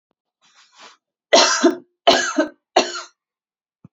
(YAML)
three_cough_length: 3.9 s
three_cough_amplitude: 30508
three_cough_signal_mean_std_ratio: 0.37
survey_phase: beta (2021-08-13 to 2022-03-07)
age: 18-44
gender: Female
wearing_mask: 'No'
symptom_none: true
smoker_status: Never smoked
respiratory_condition_asthma: false
respiratory_condition_other: false
recruitment_source: REACT
submission_delay: 0 days
covid_test_result: Negative
covid_test_method: RT-qPCR